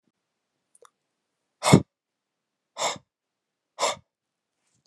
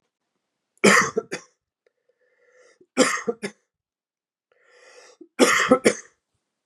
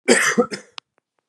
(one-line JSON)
{"exhalation_length": "4.9 s", "exhalation_amplitude": 29192, "exhalation_signal_mean_std_ratio": 0.19, "three_cough_length": "6.7 s", "three_cough_amplitude": 30012, "three_cough_signal_mean_std_ratio": 0.3, "cough_length": "1.3 s", "cough_amplitude": 31955, "cough_signal_mean_std_ratio": 0.44, "survey_phase": "beta (2021-08-13 to 2022-03-07)", "age": "45-64", "gender": "Male", "wearing_mask": "No", "symptom_none": true, "symptom_onset": "9 days", "smoker_status": "Ex-smoker", "respiratory_condition_asthma": false, "respiratory_condition_other": false, "recruitment_source": "REACT", "submission_delay": "3 days", "covid_test_result": "Negative", "covid_test_method": "RT-qPCR"}